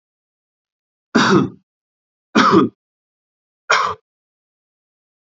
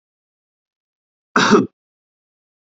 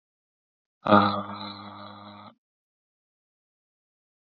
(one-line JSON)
{"three_cough_length": "5.2 s", "three_cough_amplitude": 31248, "three_cough_signal_mean_std_ratio": 0.33, "cough_length": "2.6 s", "cough_amplitude": 27733, "cough_signal_mean_std_ratio": 0.26, "exhalation_length": "4.3 s", "exhalation_amplitude": 22273, "exhalation_signal_mean_std_ratio": 0.25, "survey_phase": "beta (2021-08-13 to 2022-03-07)", "age": "18-44", "gender": "Male", "wearing_mask": "No", "symptom_none": true, "smoker_status": "Never smoked", "respiratory_condition_asthma": false, "respiratory_condition_other": false, "recruitment_source": "REACT", "submission_delay": "3 days", "covid_test_result": "Negative", "covid_test_method": "RT-qPCR", "influenza_a_test_result": "Negative", "influenza_b_test_result": "Negative"}